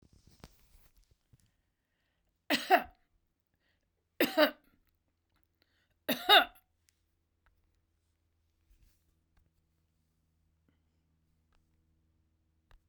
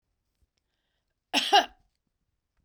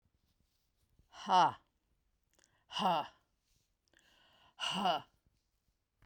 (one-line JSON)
{"three_cough_length": "12.9 s", "three_cough_amplitude": 10546, "three_cough_signal_mean_std_ratio": 0.18, "cough_length": "2.6 s", "cough_amplitude": 12989, "cough_signal_mean_std_ratio": 0.23, "exhalation_length": "6.1 s", "exhalation_amplitude": 4891, "exhalation_signal_mean_std_ratio": 0.31, "survey_phase": "beta (2021-08-13 to 2022-03-07)", "age": "65+", "gender": "Female", "wearing_mask": "No", "symptom_none": true, "smoker_status": "Never smoked", "respiratory_condition_asthma": false, "respiratory_condition_other": false, "recruitment_source": "REACT", "submission_delay": "2 days", "covid_test_result": "Negative", "covid_test_method": "RT-qPCR"}